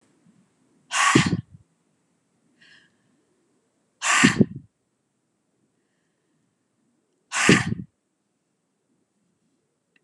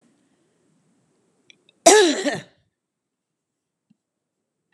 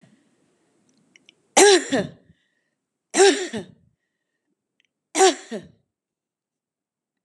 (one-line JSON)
{"exhalation_length": "10.0 s", "exhalation_amplitude": 27613, "exhalation_signal_mean_std_ratio": 0.26, "cough_length": "4.7 s", "cough_amplitude": 32767, "cough_signal_mean_std_ratio": 0.23, "three_cough_length": "7.2 s", "three_cough_amplitude": 31598, "three_cough_signal_mean_std_ratio": 0.28, "survey_phase": "beta (2021-08-13 to 2022-03-07)", "age": "65+", "gender": "Female", "wearing_mask": "No", "symptom_none": true, "symptom_onset": "8 days", "smoker_status": "Never smoked", "respiratory_condition_asthma": false, "respiratory_condition_other": false, "recruitment_source": "REACT", "submission_delay": "2 days", "covid_test_result": "Negative", "covid_test_method": "RT-qPCR", "influenza_a_test_result": "Negative", "influenza_b_test_result": "Negative"}